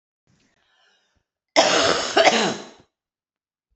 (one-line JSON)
{"cough_length": "3.8 s", "cough_amplitude": 27399, "cough_signal_mean_std_ratio": 0.39, "survey_phase": "beta (2021-08-13 to 2022-03-07)", "age": "45-64", "gender": "Female", "wearing_mask": "No", "symptom_cough_any": true, "symptom_runny_or_blocked_nose": true, "symptom_onset": "6 days", "smoker_status": "Never smoked", "respiratory_condition_asthma": false, "respiratory_condition_other": false, "recruitment_source": "REACT", "submission_delay": "2 days", "covid_test_result": "Negative", "covid_test_method": "RT-qPCR"}